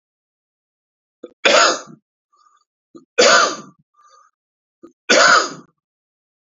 {
  "three_cough_length": "6.5 s",
  "three_cough_amplitude": 31980,
  "three_cough_signal_mean_std_ratio": 0.34,
  "survey_phase": "beta (2021-08-13 to 2022-03-07)",
  "age": "45-64",
  "gender": "Male",
  "wearing_mask": "No",
  "symptom_cough_any": true,
  "symptom_new_continuous_cough": true,
  "symptom_runny_or_blocked_nose": true,
  "symptom_sore_throat": true,
  "symptom_fatigue": true,
  "symptom_fever_high_temperature": true,
  "symptom_headache": true,
  "symptom_change_to_sense_of_smell_or_taste": true,
  "symptom_loss_of_taste": true,
  "symptom_onset": "2 days",
  "smoker_status": "Never smoked",
  "respiratory_condition_asthma": false,
  "respiratory_condition_other": false,
  "recruitment_source": "Test and Trace",
  "submission_delay": "2 days",
  "covid_test_result": "Positive",
  "covid_test_method": "RT-qPCR",
  "covid_ct_value": 14.1,
  "covid_ct_gene": "ORF1ab gene",
  "covid_ct_mean": 14.6,
  "covid_viral_load": "17000000 copies/ml",
  "covid_viral_load_category": "High viral load (>1M copies/ml)"
}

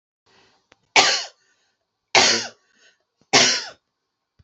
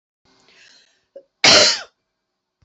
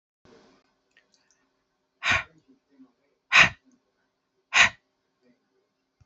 {
  "three_cough_length": "4.4 s",
  "three_cough_amplitude": 32457,
  "three_cough_signal_mean_std_ratio": 0.34,
  "cough_length": "2.6 s",
  "cough_amplitude": 31565,
  "cough_signal_mean_std_ratio": 0.29,
  "exhalation_length": "6.1 s",
  "exhalation_amplitude": 21977,
  "exhalation_signal_mean_std_ratio": 0.21,
  "survey_phase": "beta (2021-08-13 to 2022-03-07)",
  "age": "45-64",
  "gender": "Female",
  "wearing_mask": "No",
  "symptom_runny_or_blocked_nose": true,
  "smoker_status": "Never smoked",
  "respiratory_condition_asthma": false,
  "respiratory_condition_other": false,
  "recruitment_source": "REACT",
  "submission_delay": "2 days",
  "covid_test_result": "Negative",
  "covid_test_method": "RT-qPCR"
}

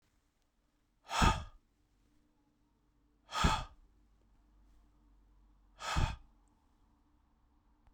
{
  "exhalation_length": "7.9 s",
  "exhalation_amplitude": 6250,
  "exhalation_signal_mean_std_ratio": 0.27,
  "survey_phase": "beta (2021-08-13 to 2022-03-07)",
  "age": "65+",
  "gender": "Male",
  "wearing_mask": "No",
  "symptom_cough_any": true,
  "symptom_runny_or_blocked_nose": true,
  "symptom_onset": "3 days",
  "smoker_status": "Ex-smoker",
  "respiratory_condition_asthma": false,
  "respiratory_condition_other": false,
  "recruitment_source": "Test and Trace",
  "submission_delay": "1 day",
  "covid_test_result": "Positive",
  "covid_test_method": "RT-qPCR",
  "covid_ct_value": 25.2,
  "covid_ct_gene": "ORF1ab gene"
}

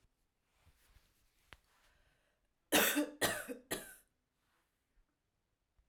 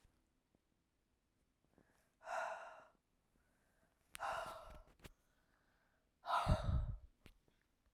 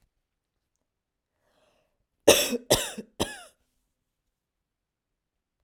{
  "three_cough_length": "5.9 s",
  "three_cough_amplitude": 6377,
  "three_cough_signal_mean_std_ratio": 0.27,
  "exhalation_length": "7.9 s",
  "exhalation_amplitude": 2973,
  "exhalation_signal_mean_std_ratio": 0.34,
  "cough_length": "5.6 s",
  "cough_amplitude": 28780,
  "cough_signal_mean_std_ratio": 0.21,
  "survey_phase": "alpha (2021-03-01 to 2021-08-12)",
  "age": "45-64",
  "gender": "Female",
  "wearing_mask": "No",
  "symptom_none": true,
  "smoker_status": "Never smoked",
  "respiratory_condition_asthma": false,
  "respiratory_condition_other": false,
  "recruitment_source": "REACT",
  "submission_delay": "2 days",
  "covid_test_result": "Negative",
  "covid_test_method": "RT-qPCR"
}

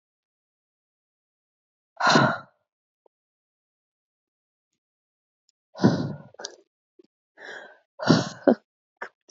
{
  "exhalation_length": "9.3 s",
  "exhalation_amplitude": 26475,
  "exhalation_signal_mean_std_ratio": 0.25,
  "survey_phase": "beta (2021-08-13 to 2022-03-07)",
  "age": "18-44",
  "gender": "Female",
  "wearing_mask": "No",
  "symptom_runny_or_blocked_nose": true,
  "symptom_headache": true,
  "symptom_onset": "3 days",
  "smoker_status": "Never smoked",
  "respiratory_condition_asthma": false,
  "respiratory_condition_other": false,
  "recruitment_source": "REACT",
  "submission_delay": "1 day",
  "covid_test_result": "Negative",
  "covid_test_method": "RT-qPCR",
  "influenza_a_test_result": "Negative",
  "influenza_b_test_result": "Negative"
}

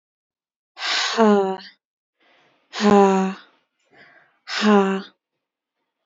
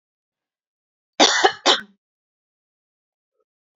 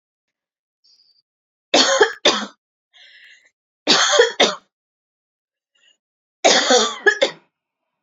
{
  "exhalation_length": "6.1 s",
  "exhalation_amplitude": 26426,
  "exhalation_signal_mean_std_ratio": 0.41,
  "cough_length": "3.8 s",
  "cough_amplitude": 29921,
  "cough_signal_mean_std_ratio": 0.25,
  "three_cough_length": "8.0 s",
  "three_cough_amplitude": 30254,
  "three_cough_signal_mean_std_ratio": 0.37,
  "survey_phase": "beta (2021-08-13 to 2022-03-07)",
  "age": "18-44",
  "gender": "Female",
  "wearing_mask": "No",
  "symptom_none": true,
  "symptom_onset": "9 days",
  "smoker_status": "Ex-smoker",
  "respiratory_condition_asthma": false,
  "respiratory_condition_other": false,
  "recruitment_source": "REACT",
  "submission_delay": "1 day",
  "covid_test_result": "Negative",
  "covid_test_method": "RT-qPCR",
  "influenza_a_test_result": "Negative",
  "influenza_b_test_result": "Negative"
}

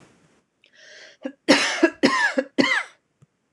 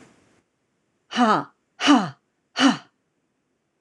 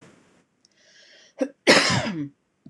{
  "three_cough_length": "3.5 s",
  "three_cough_amplitude": 25818,
  "three_cough_signal_mean_std_ratio": 0.43,
  "exhalation_length": "3.8 s",
  "exhalation_amplitude": 24857,
  "exhalation_signal_mean_std_ratio": 0.34,
  "cough_length": "2.7 s",
  "cough_amplitude": 26027,
  "cough_signal_mean_std_ratio": 0.36,
  "survey_phase": "beta (2021-08-13 to 2022-03-07)",
  "age": "45-64",
  "gender": "Female",
  "wearing_mask": "No",
  "symptom_fatigue": true,
  "smoker_status": "Never smoked",
  "respiratory_condition_asthma": false,
  "respiratory_condition_other": false,
  "recruitment_source": "REACT",
  "submission_delay": "2 days",
  "covid_test_result": "Negative",
  "covid_test_method": "RT-qPCR",
  "influenza_a_test_result": "Negative",
  "influenza_b_test_result": "Negative"
}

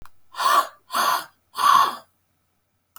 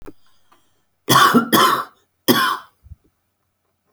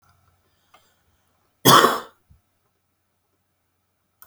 {
  "exhalation_length": "3.0 s",
  "exhalation_amplitude": 21320,
  "exhalation_signal_mean_std_ratio": 0.47,
  "three_cough_length": "3.9 s",
  "three_cough_amplitude": 32767,
  "three_cough_signal_mean_std_ratio": 0.41,
  "cough_length": "4.3 s",
  "cough_amplitude": 30786,
  "cough_signal_mean_std_ratio": 0.21,
  "survey_phase": "beta (2021-08-13 to 2022-03-07)",
  "age": "45-64",
  "gender": "Female",
  "wearing_mask": "No",
  "symptom_shortness_of_breath": true,
  "symptom_abdominal_pain": true,
  "smoker_status": "Current smoker (1 to 10 cigarettes per day)",
  "respiratory_condition_asthma": false,
  "respiratory_condition_other": false,
  "recruitment_source": "REACT",
  "submission_delay": "6 days",
  "covid_test_result": "Negative",
  "covid_test_method": "RT-qPCR"
}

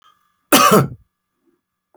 {
  "cough_length": "2.0 s",
  "cough_amplitude": 31217,
  "cough_signal_mean_std_ratio": 0.35,
  "survey_phase": "alpha (2021-03-01 to 2021-08-12)",
  "age": "45-64",
  "gender": "Male",
  "wearing_mask": "No",
  "symptom_none": true,
  "smoker_status": "Never smoked",
  "respiratory_condition_asthma": false,
  "respiratory_condition_other": false,
  "recruitment_source": "REACT",
  "submission_delay": "2 days",
  "covid_test_result": "Negative",
  "covid_test_method": "RT-qPCR"
}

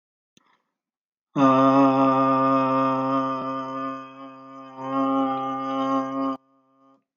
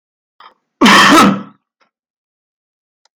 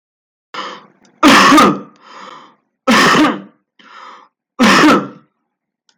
{
  "exhalation_length": "7.2 s",
  "exhalation_amplitude": 18971,
  "exhalation_signal_mean_std_ratio": 0.63,
  "cough_length": "3.2 s",
  "cough_amplitude": 32768,
  "cough_signal_mean_std_ratio": 0.39,
  "three_cough_length": "6.0 s",
  "three_cough_amplitude": 32768,
  "three_cough_signal_mean_std_ratio": 0.49,
  "survey_phase": "beta (2021-08-13 to 2022-03-07)",
  "age": "18-44",
  "gender": "Male",
  "wearing_mask": "Yes",
  "symptom_abdominal_pain": true,
  "symptom_headache": true,
  "symptom_onset": "12 days",
  "smoker_status": "Current smoker (1 to 10 cigarettes per day)",
  "respiratory_condition_asthma": false,
  "respiratory_condition_other": false,
  "recruitment_source": "REACT",
  "submission_delay": "0 days",
  "covid_test_result": "Negative",
  "covid_test_method": "RT-qPCR",
  "influenza_a_test_result": "Negative",
  "influenza_b_test_result": "Negative"
}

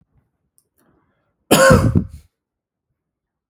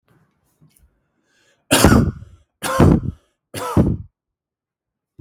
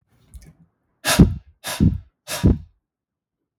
{
  "cough_length": "3.5 s",
  "cough_amplitude": 32768,
  "cough_signal_mean_std_ratio": 0.3,
  "three_cough_length": "5.2 s",
  "three_cough_amplitude": 32766,
  "three_cough_signal_mean_std_ratio": 0.36,
  "exhalation_length": "3.6 s",
  "exhalation_amplitude": 32768,
  "exhalation_signal_mean_std_ratio": 0.33,
  "survey_phase": "beta (2021-08-13 to 2022-03-07)",
  "age": "18-44",
  "gender": "Male",
  "wearing_mask": "No",
  "symptom_none": true,
  "smoker_status": "Never smoked",
  "respiratory_condition_asthma": false,
  "respiratory_condition_other": false,
  "recruitment_source": "REACT",
  "submission_delay": "2 days",
  "covid_test_result": "Negative",
  "covid_test_method": "RT-qPCR",
  "influenza_a_test_result": "Unknown/Void",
  "influenza_b_test_result": "Unknown/Void"
}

